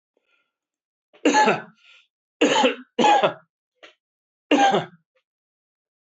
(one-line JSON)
{"cough_length": "6.1 s", "cough_amplitude": 21329, "cough_signal_mean_std_ratio": 0.39, "survey_phase": "alpha (2021-03-01 to 2021-08-12)", "age": "65+", "gender": "Male", "wearing_mask": "No", "symptom_none": true, "smoker_status": "Ex-smoker", "respiratory_condition_asthma": false, "respiratory_condition_other": false, "recruitment_source": "REACT", "submission_delay": "2 days", "covid_test_result": "Negative", "covid_test_method": "RT-qPCR"}